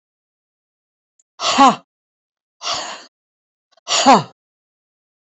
exhalation_length: 5.4 s
exhalation_amplitude: 28098
exhalation_signal_mean_std_ratio: 0.29
survey_phase: beta (2021-08-13 to 2022-03-07)
age: 45-64
gender: Female
wearing_mask: 'No'
symptom_none: true
smoker_status: Never smoked
respiratory_condition_asthma: false
respiratory_condition_other: false
recruitment_source: Test and Trace
submission_delay: 1 day
covid_test_result: Negative
covid_test_method: RT-qPCR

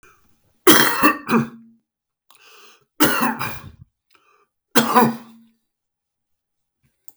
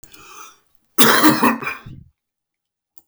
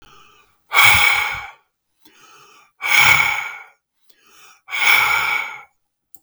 three_cough_length: 7.2 s
three_cough_amplitude: 32768
three_cough_signal_mean_std_ratio: 0.35
cough_length: 3.1 s
cough_amplitude: 32768
cough_signal_mean_std_ratio: 0.38
exhalation_length: 6.2 s
exhalation_amplitude: 32768
exhalation_signal_mean_std_ratio: 0.47
survey_phase: beta (2021-08-13 to 2022-03-07)
age: 65+
gender: Male
wearing_mask: 'No'
symptom_cough_any: true
symptom_onset: 5 days
smoker_status: Ex-smoker
respiratory_condition_asthma: false
respiratory_condition_other: false
recruitment_source: REACT
submission_delay: 1 day
covid_test_result: Negative
covid_test_method: RT-qPCR
influenza_a_test_result: Negative
influenza_b_test_result: Negative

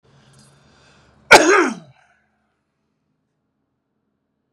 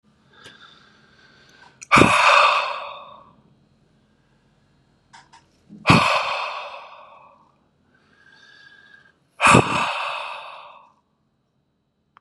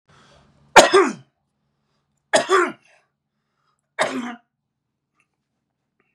cough_length: 4.5 s
cough_amplitude: 32768
cough_signal_mean_std_ratio: 0.23
exhalation_length: 12.2 s
exhalation_amplitude: 32768
exhalation_signal_mean_std_ratio: 0.34
three_cough_length: 6.1 s
three_cough_amplitude: 32768
three_cough_signal_mean_std_ratio: 0.27
survey_phase: beta (2021-08-13 to 2022-03-07)
age: 45-64
gender: Male
wearing_mask: 'No'
symptom_none: true
smoker_status: Never smoked
respiratory_condition_asthma: true
respiratory_condition_other: false
recruitment_source: REACT
submission_delay: 0 days
covid_test_result: Negative
covid_test_method: RT-qPCR
influenza_a_test_result: Negative
influenza_b_test_result: Negative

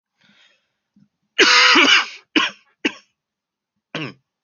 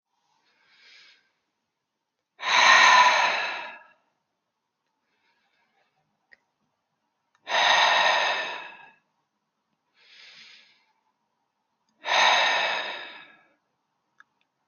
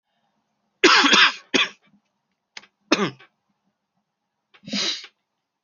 cough_length: 4.4 s
cough_amplitude: 28761
cough_signal_mean_std_ratio: 0.37
exhalation_length: 14.7 s
exhalation_amplitude: 21411
exhalation_signal_mean_std_ratio: 0.36
three_cough_length: 5.6 s
three_cough_amplitude: 29795
three_cough_signal_mean_std_ratio: 0.32
survey_phase: alpha (2021-03-01 to 2021-08-12)
age: 18-44
gender: Male
wearing_mask: 'No'
symptom_none: true
smoker_status: Never smoked
respiratory_condition_asthma: false
respiratory_condition_other: false
recruitment_source: REACT
submission_delay: 3 days
covid_test_result: Negative
covid_test_method: RT-qPCR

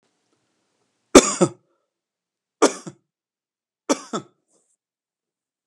three_cough_length: 5.7 s
three_cough_amplitude: 32768
three_cough_signal_mean_std_ratio: 0.18
survey_phase: alpha (2021-03-01 to 2021-08-12)
age: 65+
gender: Male
wearing_mask: 'No'
symptom_none: true
smoker_status: Ex-smoker
respiratory_condition_asthma: false
respiratory_condition_other: false
recruitment_source: REACT
submission_delay: 2 days
covid_test_result: Negative
covid_test_method: RT-qPCR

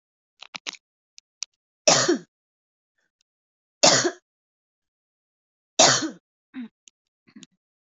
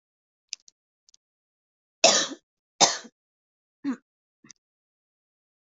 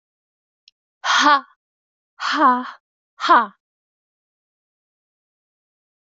three_cough_length: 7.9 s
three_cough_amplitude: 26624
three_cough_signal_mean_std_ratio: 0.25
cough_length: 5.6 s
cough_amplitude: 27027
cough_signal_mean_std_ratio: 0.21
exhalation_length: 6.1 s
exhalation_amplitude: 24265
exhalation_signal_mean_std_ratio: 0.31
survey_phase: beta (2021-08-13 to 2022-03-07)
age: 18-44
gender: Female
wearing_mask: 'No'
symptom_cough_any: true
symptom_fatigue: true
symptom_fever_high_temperature: true
symptom_onset: 5 days
smoker_status: Never smoked
respiratory_condition_asthma: false
respiratory_condition_other: false
recruitment_source: Test and Trace
submission_delay: 2 days
covid_test_result: Positive
covid_test_method: ePCR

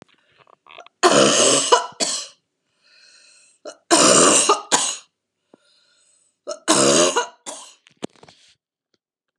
three_cough_length: 9.4 s
three_cough_amplitude: 32169
three_cough_signal_mean_std_ratio: 0.42
survey_phase: alpha (2021-03-01 to 2021-08-12)
age: 45-64
gender: Female
wearing_mask: 'No'
symptom_loss_of_taste: true
smoker_status: Never smoked
respiratory_condition_asthma: false
respiratory_condition_other: false
recruitment_source: Test and Trace
submission_delay: 1 day
covid_test_result: Positive
covid_test_method: RT-qPCR
covid_ct_value: 19.8
covid_ct_gene: ORF1ab gene
covid_ct_mean: 20.6
covid_viral_load: 170000 copies/ml
covid_viral_load_category: Low viral load (10K-1M copies/ml)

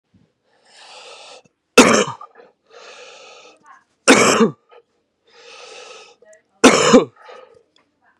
three_cough_length: 8.2 s
three_cough_amplitude: 32768
three_cough_signal_mean_std_ratio: 0.3
survey_phase: beta (2021-08-13 to 2022-03-07)
age: 18-44
gender: Male
wearing_mask: 'No'
symptom_cough_any: true
symptom_new_continuous_cough: true
symptom_runny_or_blocked_nose: true
symptom_other: true
symptom_onset: 3 days
smoker_status: Never smoked
respiratory_condition_asthma: false
respiratory_condition_other: false
recruitment_source: Test and Trace
submission_delay: 2 days
covid_test_result: Positive
covid_test_method: RT-qPCR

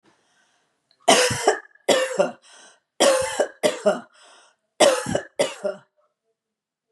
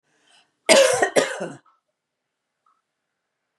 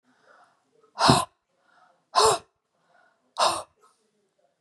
three_cough_length: 6.9 s
three_cough_amplitude: 28731
three_cough_signal_mean_std_ratio: 0.43
cough_length: 3.6 s
cough_amplitude: 30330
cough_signal_mean_std_ratio: 0.31
exhalation_length: 4.6 s
exhalation_amplitude: 26089
exhalation_signal_mean_std_ratio: 0.3
survey_phase: beta (2021-08-13 to 2022-03-07)
age: 65+
gender: Female
wearing_mask: 'No'
symptom_none: true
smoker_status: Never smoked
respiratory_condition_asthma: false
respiratory_condition_other: false
recruitment_source: REACT
submission_delay: 1 day
covid_test_result: Negative
covid_test_method: RT-qPCR
influenza_a_test_result: Negative
influenza_b_test_result: Negative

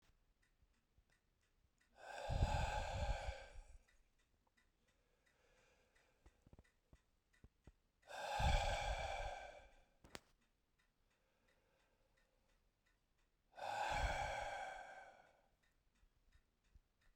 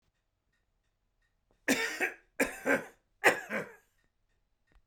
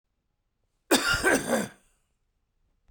exhalation_length: 17.2 s
exhalation_amplitude: 1718
exhalation_signal_mean_std_ratio: 0.4
three_cough_length: 4.9 s
three_cough_amplitude: 12035
three_cough_signal_mean_std_ratio: 0.33
cough_length: 2.9 s
cough_amplitude: 14617
cough_signal_mean_std_ratio: 0.38
survey_phase: beta (2021-08-13 to 2022-03-07)
age: 45-64
gender: Male
wearing_mask: 'No'
symptom_diarrhoea: true
smoker_status: Ex-smoker
respiratory_condition_asthma: false
respiratory_condition_other: false
recruitment_source: Test and Trace
submission_delay: 0 days
covid_test_result: Negative
covid_test_method: LFT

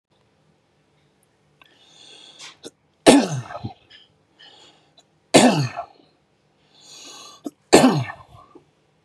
three_cough_length: 9.0 s
three_cough_amplitude: 32768
three_cough_signal_mean_std_ratio: 0.27
survey_phase: beta (2021-08-13 to 2022-03-07)
age: 45-64
gender: Male
wearing_mask: 'No'
symptom_none: true
smoker_status: Ex-smoker
respiratory_condition_asthma: false
respiratory_condition_other: false
recruitment_source: REACT
submission_delay: 2 days
covid_test_result: Negative
covid_test_method: RT-qPCR
influenza_a_test_result: Negative
influenza_b_test_result: Negative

